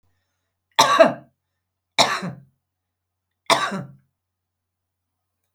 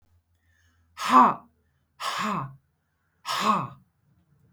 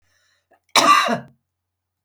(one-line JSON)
{"three_cough_length": "5.5 s", "three_cough_amplitude": 32767, "three_cough_signal_mean_std_ratio": 0.28, "exhalation_length": "4.5 s", "exhalation_amplitude": 19177, "exhalation_signal_mean_std_ratio": 0.35, "cough_length": "2.0 s", "cough_amplitude": 32766, "cough_signal_mean_std_ratio": 0.36, "survey_phase": "beta (2021-08-13 to 2022-03-07)", "age": "65+", "gender": "Female", "wearing_mask": "No", "symptom_none": true, "smoker_status": "Never smoked", "respiratory_condition_asthma": false, "respiratory_condition_other": false, "recruitment_source": "REACT", "submission_delay": "1 day", "covid_test_result": "Negative", "covid_test_method": "RT-qPCR", "influenza_a_test_result": "Negative", "influenza_b_test_result": "Negative"}